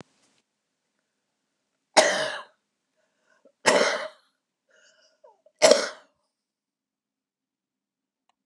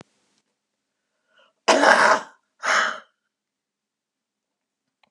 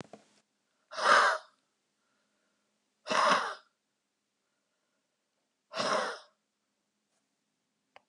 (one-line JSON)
{"three_cough_length": "8.5 s", "three_cough_amplitude": 29764, "three_cough_signal_mean_std_ratio": 0.24, "cough_length": "5.1 s", "cough_amplitude": 31519, "cough_signal_mean_std_ratio": 0.31, "exhalation_length": "8.1 s", "exhalation_amplitude": 10780, "exhalation_signal_mean_std_ratio": 0.3, "survey_phase": "beta (2021-08-13 to 2022-03-07)", "age": "65+", "gender": "Female", "wearing_mask": "No", "symptom_none": true, "smoker_status": "Ex-smoker", "respiratory_condition_asthma": false, "respiratory_condition_other": true, "recruitment_source": "REACT", "submission_delay": "3 days", "covid_test_result": "Negative", "covid_test_method": "RT-qPCR", "influenza_a_test_result": "Negative", "influenza_b_test_result": "Negative"}